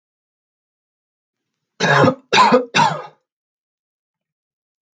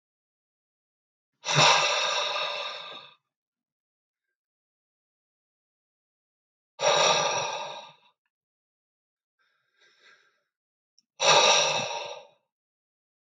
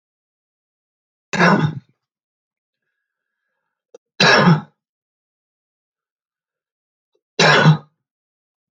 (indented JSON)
{
  "cough_length": "4.9 s",
  "cough_amplitude": 28857,
  "cough_signal_mean_std_ratio": 0.34,
  "exhalation_length": "13.4 s",
  "exhalation_amplitude": 15008,
  "exhalation_signal_mean_std_ratio": 0.36,
  "three_cough_length": "8.7 s",
  "three_cough_amplitude": 29926,
  "three_cough_signal_mean_std_ratio": 0.29,
  "survey_phase": "alpha (2021-03-01 to 2021-08-12)",
  "age": "18-44",
  "gender": "Male",
  "wearing_mask": "No",
  "symptom_none": true,
  "smoker_status": "Never smoked",
  "respiratory_condition_asthma": false,
  "respiratory_condition_other": false,
  "recruitment_source": "REACT",
  "submission_delay": "1 day",
  "covid_test_result": "Negative",
  "covid_test_method": "RT-qPCR"
}